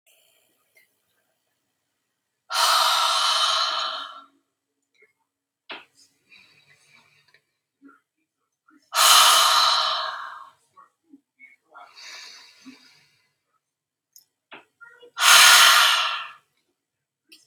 {
  "exhalation_length": "17.5 s",
  "exhalation_amplitude": 32767,
  "exhalation_signal_mean_std_ratio": 0.36,
  "survey_phase": "beta (2021-08-13 to 2022-03-07)",
  "age": "18-44",
  "gender": "Female",
  "wearing_mask": "No",
  "symptom_none": true,
  "smoker_status": "Never smoked",
  "respiratory_condition_asthma": false,
  "respiratory_condition_other": false,
  "recruitment_source": "REACT",
  "submission_delay": "13 days",
  "covid_test_result": "Negative",
  "covid_test_method": "RT-qPCR",
  "influenza_a_test_result": "Negative",
  "influenza_b_test_result": "Negative"
}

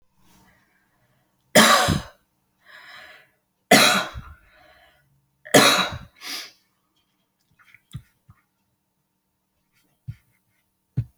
{
  "three_cough_length": "11.2 s",
  "three_cough_amplitude": 30009,
  "three_cough_signal_mean_std_ratio": 0.27,
  "survey_phase": "beta (2021-08-13 to 2022-03-07)",
  "age": "45-64",
  "gender": "Female",
  "wearing_mask": "No",
  "symptom_none": true,
  "smoker_status": "Ex-smoker",
  "respiratory_condition_asthma": false,
  "respiratory_condition_other": false,
  "recruitment_source": "REACT",
  "submission_delay": "1 day",
  "covid_test_result": "Negative",
  "covid_test_method": "RT-qPCR"
}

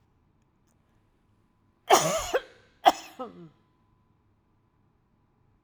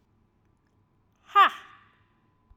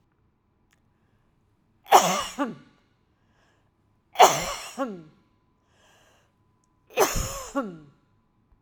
{
  "cough_length": "5.6 s",
  "cough_amplitude": 20396,
  "cough_signal_mean_std_ratio": 0.23,
  "exhalation_length": "2.6 s",
  "exhalation_amplitude": 14785,
  "exhalation_signal_mean_std_ratio": 0.21,
  "three_cough_length": "8.6 s",
  "three_cough_amplitude": 32767,
  "three_cough_signal_mean_std_ratio": 0.27,
  "survey_phase": "alpha (2021-03-01 to 2021-08-12)",
  "age": "45-64",
  "gender": "Female",
  "wearing_mask": "No",
  "symptom_none": true,
  "smoker_status": "Never smoked",
  "respiratory_condition_asthma": false,
  "respiratory_condition_other": false,
  "recruitment_source": "REACT",
  "submission_delay": "4 days",
  "covid_test_result": "Negative",
  "covid_test_method": "RT-qPCR"
}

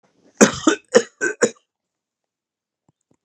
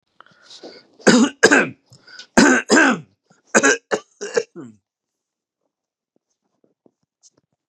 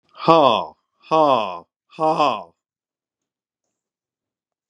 {
  "cough_length": "3.2 s",
  "cough_amplitude": 32768,
  "cough_signal_mean_std_ratio": 0.27,
  "three_cough_length": "7.7 s",
  "three_cough_amplitude": 32768,
  "three_cough_signal_mean_std_ratio": 0.34,
  "exhalation_length": "4.7 s",
  "exhalation_amplitude": 32635,
  "exhalation_signal_mean_std_ratio": 0.36,
  "survey_phase": "beta (2021-08-13 to 2022-03-07)",
  "age": "65+",
  "gender": "Male",
  "wearing_mask": "No",
  "symptom_none": true,
  "smoker_status": "Ex-smoker",
  "respiratory_condition_asthma": false,
  "respiratory_condition_other": false,
  "recruitment_source": "REACT",
  "submission_delay": "2 days",
  "covid_test_result": "Negative",
  "covid_test_method": "RT-qPCR",
  "influenza_a_test_result": "Negative",
  "influenza_b_test_result": "Negative"
}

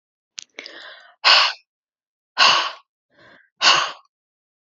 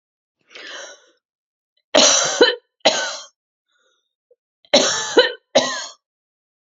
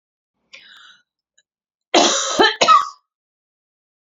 {
  "exhalation_length": "4.6 s",
  "exhalation_amplitude": 32220,
  "exhalation_signal_mean_std_ratio": 0.35,
  "three_cough_length": "6.7 s",
  "three_cough_amplitude": 31345,
  "three_cough_signal_mean_std_ratio": 0.37,
  "cough_length": "4.0 s",
  "cough_amplitude": 32767,
  "cough_signal_mean_std_ratio": 0.35,
  "survey_phase": "beta (2021-08-13 to 2022-03-07)",
  "age": "45-64",
  "gender": "Female",
  "wearing_mask": "No",
  "symptom_none": true,
  "smoker_status": "Never smoked",
  "respiratory_condition_asthma": false,
  "respiratory_condition_other": false,
  "recruitment_source": "REACT",
  "submission_delay": "4 days",
  "covid_test_result": "Negative",
  "covid_test_method": "RT-qPCR",
  "influenza_a_test_result": "Negative",
  "influenza_b_test_result": "Negative"
}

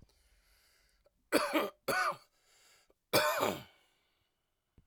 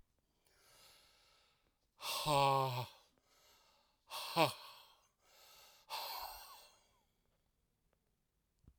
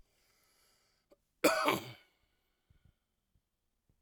{
  "three_cough_length": "4.9 s",
  "three_cough_amplitude": 7818,
  "three_cough_signal_mean_std_ratio": 0.38,
  "exhalation_length": "8.8 s",
  "exhalation_amplitude": 4871,
  "exhalation_signal_mean_std_ratio": 0.32,
  "cough_length": "4.0 s",
  "cough_amplitude": 7007,
  "cough_signal_mean_std_ratio": 0.24,
  "survey_phase": "alpha (2021-03-01 to 2021-08-12)",
  "age": "45-64",
  "gender": "Male",
  "wearing_mask": "No",
  "symptom_none": true,
  "smoker_status": "Never smoked",
  "respiratory_condition_asthma": false,
  "respiratory_condition_other": false,
  "recruitment_source": "REACT",
  "submission_delay": "1 day",
  "covid_test_result": "Negative",
  "covid_test_method": "RT-qPCR"
}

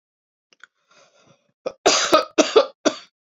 {
  "cough_length": "3.2 s",
  "cough_amplitude": 29861,
  "cough_signal_mean_std_ratio": 0.34,
  "survey_phase": "beta (2021-08-13 to 2022-03-07)",
  "age": "45-64",
  "gender": "Female",
  "wearing_mask": "No",
  "symptom_none": true,
  "smoker_status": "Never smoked",
  "respiratory_condition_asthma": false,
  "respiratory_condition_other": false,
  "recruitment_source": "REACT",
  "submission_delay": "2 days",
  "covid_test_result": "Negative",
  "covid_test_method": "RT-qPCR"
}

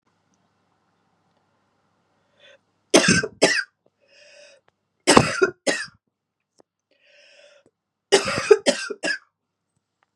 {
  "three_cough_length": "10.2 s",
  "three_cough_amplitude": 32768,
  "three_cough_signal_mean_std_ratio": 0.28,
  "survey_phase": "beta (2021-08-13 to 2022-03-07)",
  "age": "65+",
  "gender": "Female",
  "wearing_mask": "No",
  "symptom_cough_any": true,
  "symptom_runny_or_blocked_nose": true,
  "symptom_headache": true,
  "smoker_status": "Ex-smoker",
  "respiratory_condition_asthma": false,
  "respiratory_condition_other": false,
  "recruitment_source": "Test and Trace",
  "submission_delay": "1 day",
  "covid_test_result": "Positive",
  "covid_test_method": "ePCR"
}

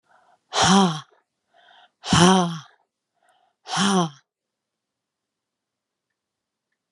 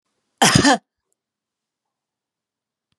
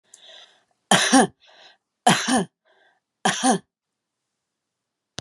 {
  "exhalation_length": "6.9 s",
  "exhalation_amplitude": 28808,
  "exhalation_signal_mean_std_ratio": 0.33,
  "cough_length": "3.0 s",
  "cough_amplitude": 32425,
  "cough_signal_mean_std_ratio": 0.26,
  "three_cough_length": "5.2 s",
  "three_cough_amplitude": 31551,
  "three_cough_signal_mean_std_ratio": 0.33,
  "survey_phase": "beta (2021-08-13 to 2022-03-07)",
  "age": "65+",
  "gender": "Female",
  "wearing_mask": "No",
  "symptom_none": true,
  "smoker_status": "Never smoked",
  "respiratory_condition_asthma": false,
  "respiratory_condition_other": false,
  "recruitment_source": "REACT",
  "submission_delay": "2 days",
  "covid_test_result": "Negative",
  "covid_test_method": "RT-qPCR"
}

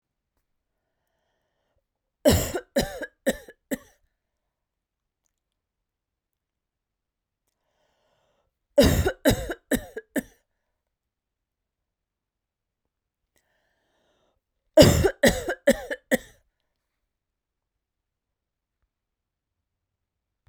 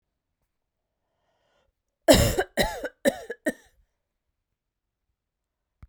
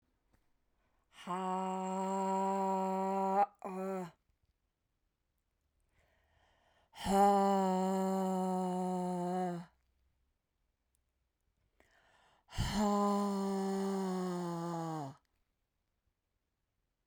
{
  "three_cough_length": "20.5 s",
  "three_cough_amplitude": 32767,
  "three_cough_signal_mean_std_ratio": 0.22,
  "cough_length": "5.9 s",
  "cough_amplitude": 22985,
  "cough_signal_mean_std_ratio": 0.25,
  "exhalation_length": "17.1 s",
  "exhalation_amplitude": 4234,
  "exhalation_signal_mean_std_ratio": 0.61,
  "survey_phase": "beta (2021-08-13 to 2022-03-07)",
  "age": "45-64",
  "gender": "Female",
  "wearing_mask": "No",
  "symptom_none": true,
  "smoker_status": "Never smoked",
  "respiratory_condition_asthma": false,
  "respiratory_condition_other": false,
  "recruitment_source": "REACT",
  "submission_delay": "1 day",
  "covid_test_result": "Negative",
  "covid_test_method": "RT-qPCR"
}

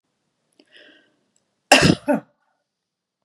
{
  "cough_length": "3.2 s",
  "cough_amplitude": 32768,
  "cough_signal_mean_std_ratio": 0.24,
  "survey_phase": "beta (2021-08-13 to 2022-03-07)",
  "age": "45-64",
  "gender": "Female",
  "wearing_mask": "No",
  "symptom_sore_throat": true,
  "smoker_status": "Never smoked",
  "respiratory_condition_asthma": false,
  "respiratory_condition_other": false,
  "recruitment_source": "REACT",
  "submission_delay": "2 days",
  "covid_test_result": "Negative",
  "covid_test_method": "RT-qPCR",
  "influenza_a_test_result": "Negative",
  "influenza_b_test_result": "Negative"
}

